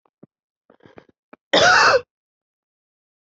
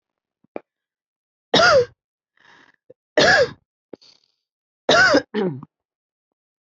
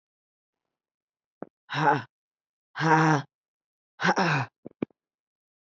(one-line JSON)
{"cough_length": "3.2 s", "cough_amplitude": 25045, "cough_signal_mean_std_ratio": 0.32, "three_cough_length": "6.7 s", "three_cough_amplitude": 26529, "three_cough_signal_mean_std_ratio": 0.35, "exhalation_length": "5.7 s", "exhalation_amplitude": 16905, "exhalation_signal_mean_std_ratio": 0.35, "survey_phase": "beta (2021-08-13 to 2022-03-07)", "age": "18-44", "wearing_mask": "No", "symptom_cough_any": true, "symptom_runny_or_blocked_nose": true, "symptom_shortness_of_breath": true, "symptom_fatigue": true, "symptom_change_to_sense_of_smell_or_taste": true, "symptom_loss_of_taste": true, "symptom_other": true, "symptom_onset": "6 days", "smoker_status": "Prefer not to say", "respiratory_condition_asthma": false, "respiratory_condition_other": false, "recruitment_source": "Test and Trace", "submission_delay": "1 day", "covid_test_result": "Positive", "covid_test_method": "RT-qPCR", "covid_ct_value": 19.8, "covid_ct_gene": "ORF1ab gene", "covid_ct_mean": 20.4, "covid_viral_load": "210000 copies/ml", "covid_viral_load_category": "Low viral load (10K-1M copies/ml)"}